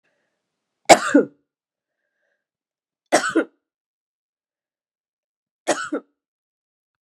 {"three_cough_length": "7.1 s", "three_cough_amplitude": 32768, "three_cough_signal_mean_std_ratio": 0.21, "survey_phase": "beta (2021-08-13 to 2022-03-07)", "age": "65+", "gender": "Female", "wearing_mask": "No", "symptom_cough_any": true, "symptom_runny_or_blocked_nose": true, "symptom_fatigue": true, "symptom_fever_high_temperature": true, "symptom_headache": true, "symptom_change_to_sense_of_smell_or_taste": true, "symptom_onset": "3 days", "smoker_status": "Never smoked", "respiratory_condition_asthma": false, "respiratory_condition_other": false, "recruitment_source": "Test and Trace", "submission_delay": "1 day", "covid_test_result": "Positive", "covid_test_method": "LAMP"}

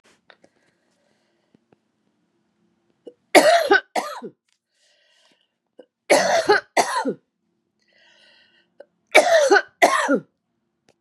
{"three_cough_length": "11.0 s", "three_cough_amplitude": 32767, "three_cough_signal_mean_std_ratio": 0.35, "survey_phase": "beta (2021-08-13 to 2022-03-07)", "age": "45-64", "gender": "Female", "wearing_mask": "No", "symptom_cough_any": true, "symptom_runny_or_blocked_nose": true, "symptom_fatigue": true, "symptom_headache": true, "symptom_change_to_sense_of_smell_or_taste": true, "symptom_onset": "2 days", "smoker_status": "Never smoked", "respiratory_condition_asthma": false, "respiratory_condition_other": false, "recruitment_source": "Test and Trace", "submission_delay": "2 days", "covid_test_result": "Positive", "covid_test_method": "RT-qPCR", "covid_ct_value": 14.9, "covid_ct_gene": "ORF1ab gene", "covid_ct_mean": 15.3, "covid_viral_load": "9800000 copies/ml", "covid_viral_load_category": "High viral load (>1M copies/ml)"}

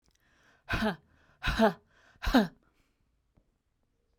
{"exhalation_length": "4.2 s", "exhalation_amplitude": 10108, "exhalation_signal_mean_std_ratio": 0.32, "survey_phase": "beta (2021-08-13 to 2022-03-07)", "age": "45-64", "gender": "Female", "wearing_mask": "No", "symptom_none": true, "smoker_status": "Ex-smoker", "respiratory_condition_asthma": false, "respiratory_condition_other": false, "recruitment_source": "REACT", "submission_delay": "2 days", "covid_test_result": "Negative", "covid_test_method": "RT-qPCR"}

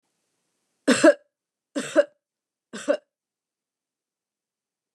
{"three_cough_length": "4.9 s", "three_cough_amplitude": 20702, "three_cough_signal_mean_std_ratio": 0.23, "survey_phase": "beta (2021-08-13 to 2022-03-07)", "age": "45-64", "gender": "Female", "wearing_mask": "No", "symptom_none": true, "smoker_status": "Never smoked", "respiratory_condition_asthma": false, "respiratory_condition_other": false, "recruitment_source": "REACT", "submission_delay": "0 days", "covid_test_result": "Negative", "covid_test_method": "RT-qPCR", "influenza_a_test_result": "Negative", "influenza_b_test_result": "Negative"}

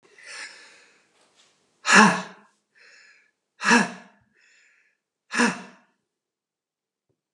{"exhalation_length": "7.3 s", "exhalation_amplitude": 29074, "exhalation_signal_mean_std_ratio": 0.26, "survey_phase": "alpha (2021-03-01 to 2021-08-12)", "age": "45-64", "gender": "Male", "wearing_mask": "No", "symptom_none": true, "smoker_status": "Never smoked", "respiratory_condition_asthma": false, "respiratory_condition_other": false, "recruitment_source": "REACT", "submission_delay": "1 day", "covid_test_result": "Negative", "covid_test_method": "RT-qPCR"}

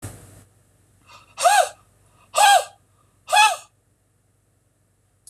{"exhalation_length": "5.3 s", "exhalation_amplitude": 22699, "exhalation_signal_mean_std_ratio": 0.33, "survey_phase": "beta (2021-08-13 to 2022-03-07)", "age": "45-64", "gender": "Male", "wearing_mask": "No", "symptom_runny_or_blocked_nose": true, "smoker_status": "Never smoked", "respiratory_condition_asthma": false, "respiratory_condition_other": false, "recruitment_source": "REACT", "submission_delay": "1 day", "covid_test_result": "Negative", "covid_test_method": "RT-qPCR", "influenza_a_test_result": "Negative", "influenza_b_test_result": "Negative"}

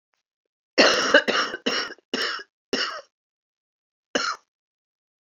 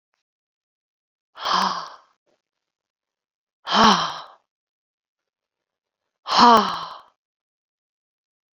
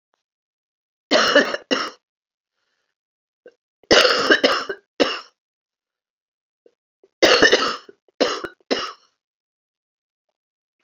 {"cough_length": "5.2 s", "cough_amplitude": 27327, "cough_signal_mean_std_ratio": 0.39, "exhalation_length": "8.5 s", "exhalation_amplitude": 28202, "exhalation_signal_mean_std_ratio": 0.28, "three_cough_length": "10.8 s", "three_cough_amplitude": 32767, "three_cough_signal_mean_std_ratio": 0.34, "survey_phase": "beta (2021-08-13 to 2022-03-07)", "age": "65+", "gender": "Female", "wearing_mask": "No", "symptom_cough_any": true, "symptom_new_continuous_cough": true, "symptom_runny_or_blocked_nose": true, "symptom_shortness_of_breath": true, "symptom_fatigue": true, "symptom_fever_high_temperature": true, "symptom_headache": true, "symptom_change_to_sense_of_smell_or_taste": true, "symptom_loss_of_taste": true, "symptom_onset": "5 days", "smoker_status": "Never smoked", "respiratory_condition_asthma": false, "respiratory_condition_other": false, "recruitment_source": "Test and Trace", "submission_delay": "2 days", "covid_test_result": "Positive", "covid_test_method": "RT-qPCR", "covid_ct_value": 19.7, "covid_ct_gene": "ORF1ab gene"}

